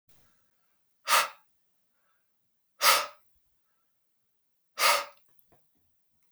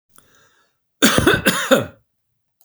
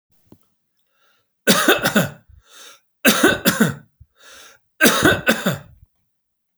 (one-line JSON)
{"exhalation_length": "6.3 s", "exhalation_amplitude": 14581, "exhalation_signal_mean_std_ratio": 0.26, "cough_length": "2.6 s", "cough_amplitude": 32767, "cough_signal_mean_std_ratio": 0.41, "three_cough_length": "6.6 s", "three_cough_amplitude": 32768, "three_cough_signal_mean_std_ratio": 0.41, "survey_phase": "beta (2021-08-13 to 2022-03-07)", "age": "45-64", "gender": "Male", "wearing_mask": "No", "symptom_none": true, "smoker_status": "Ex-smoker", "respiratory_condition_asthma": false, "respiratory_condition_other": false, "recruitment_source": "REACT", "submission_delay": "2 days", "covid_test_result": "Negative", "covid_test_method": "RT-qPCR", "influenza_a_test_result": "Negative", "influenza_b_test_result": "Negative"}